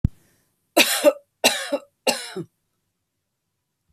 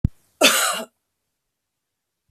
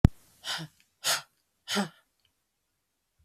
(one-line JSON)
{"three_cough_length": "3.9 s", "three_cough_amplitude": 32768, "three_cough_signal_mean_std_ratio": 0.32, "cough_length": "2.3 s", "cough_amplitude": 30266, "cough_signal_mean_std_ratio": 0.32, "exhalation_length": "3.2 s", "exhalation_amplitude": 23602, "exhalation_signal_mean_std_ratio": 0.22, "survey_phase": "beta (2021-08-13 to 2022-03-07)", "age": "45-64", "gender": "Female", "wearing_mask": "No", "symptom_none": true, "smoker_status": "Never smoked", "respiratory_condition_asthma": true, "respiratory_condition_other": false, "recruitment_source": "REACT", "submission_delay": "1 day", "covid_test_result": "Negative", "covid_test_method": "RT-qPCR"}